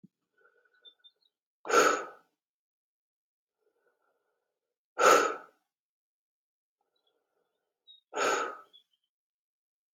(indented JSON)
{
  "exhalation_length": "9.9 s",
  "exhalation_amplitude": 11730,
  "exhalation_signal_mean_std_ratio": 0.24,
  "survey_phase": "beta (2021-08-13 to 2022-03-07)",
  "age": "45-64",
  "gender": "Male",
  "wearing_mask": "No",
  "symptom_cough_any": true,
  "symptom_runny_or_blocked_nose": true,
  "symptom_sore_throat": true,
  "smoker_status": "Ex-smoker",
  "respiratory_condition_asthma": false,
  "respiratory_condition_other": false,
  "recruitment_source": "Test and Trace",
  "submission_delay": "1 day",
  "covid_test_result": "Positive",
  "covid_test_method": "ePCR"
}